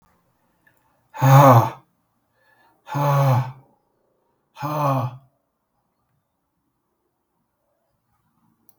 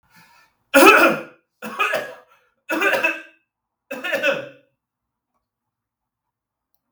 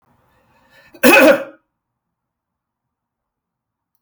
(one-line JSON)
{"exhalation_length": "8.8 s", "exhalation_amplitude": 32494, "exhalation_signal_mean_std_ratio": 0.31, "three_cough_length": "6.9 s", "three_cough_amplitude": 32768, "three_cough_signal_mean_std_ratio": 0.34, "cough_length": "4.0 s", "cough_amplitude": 32768, "cough_signal_mean_std_ratio": 0.26, "survey_phase": "beta (2021-08-13 to 2022-03-07)", "age": "45-64", "gender": "Male", "wearing_mask": "No", "symptom_none": true, "smoker_status": "Never smoked", "respiratory_condition_asthma": false, "respiratory_condition_other": false, "recruitment_source": "REACT", "submission_delay": "4 days", "covid_test_result": "Negative", "covid_test_method": "RT-qPCR"}